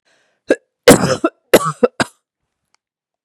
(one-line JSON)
{"cough_length": "3.2 s", "cough_amplitude": 32768, "cough_signal_mean_std_ratio": 0.3, "survey_phase": "beta (2021-08-13 to 2022-03-07)", "age": "45-64", "gender": "Female", "wearing_mask": "No", "symptom_none": true, "smoker_status": "Never smoked", "respiratory_condition_asthma": false, "respiratory_condition_other": false, "recruitment_source": "REACT", "submission_delay": "2 days", "covid_test_result": "Negative", "covid_test_method": "RT-qPCR", "influenza_a_test_result": "Negative", "influenza_b_test_result": "Negative"}